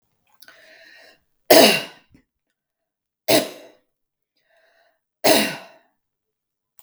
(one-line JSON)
{"three_cough_length": "6.8 s", "three_cough_amplitude": 32768, "three_cough_signal_mean_std_ratio": 0.25, "survey_phase": "beta (2021-08-13 to 2022-03-07)", "age": "45-64", "gender": "Female", "wearing_mask": "No", "symptom_none": true, "symptom_onset": "12 days", "smoker_status": "Never smoked", "respiratory_condition_asthma": false, "respiratory_condition_other": false, "recruitment_source": "REACT", "submission_delay": "1 day", "covid_test_result": "Negative", "covid_test_method": "RT-qPCR", "influenza_a_test_result": "Negative", "influenza_b_test_result": "Negative"}